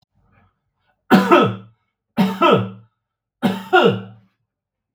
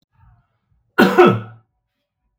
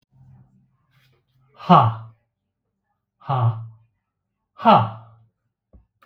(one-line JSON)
{"three_cough_length": "4.9 s", "three_cough_amplitude": 32768, "three_cough_signal_mean_std_ratio": 0.41, "cough_length": "2.4 s", "cough_amplitude": 32768, "cough_signal_mean_std_ratio": 0.32, "exhalation_length": "6.1 s", "exhalation_amplitude": 32768, "exhalation_signal_mean_std_ratio": 0.28, "survey_phase": "beta (2021-08-13 to 2022-03-07)", "age": "65+", "gender": "Male", "wearing_mask": "No", "symptom_none": true, "smoker_status": "Ex-smoker", "respiratory_condition_asthma": false, "respiratory_condition_other": false, "recruitment_source": "REACT", "submission_delay": "5 days", "covid_test_result": "Negative", "covid_test_method": "RT-qPCR"}